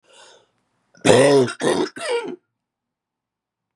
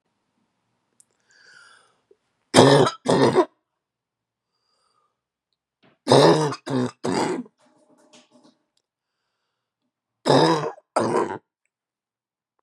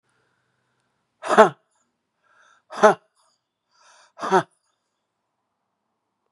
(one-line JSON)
{"cough_length": "3.8 s", "cough_amplitude": 32768, "cough_signal_mean_std_ratio": 0.41, "three_cough_length": "12.6 s", "three_cough_amplitude": 32768, "three_cough_signal_mean_std_ratio": 0.33, "exhalation_length": "6.3 s", "exhalation_amplitude": 32767, "exhalation_signal_mean_std_ratio": 0.2, "survey_phase": "beta (2021-08-13 to 2022-03-07)", "age": "45-64", "gender": "Female", "wearing_mask": "No", "symptom_cough_any": true, "symptom_runny_or_blocked_nose": true, "symptom_shortness_of_breath": true, "symptom_diarrhoea": true, "symptom_fatigue": true, "smoker_status": "Ex-smoker", "respiratory_condition_asthma": false, "respiratory_condition_other": false, "recruitment_source": "Test and Trace", "submission_delay": "0 days", "covid_test_result": "Negative", "covid_test_method": "LFT"}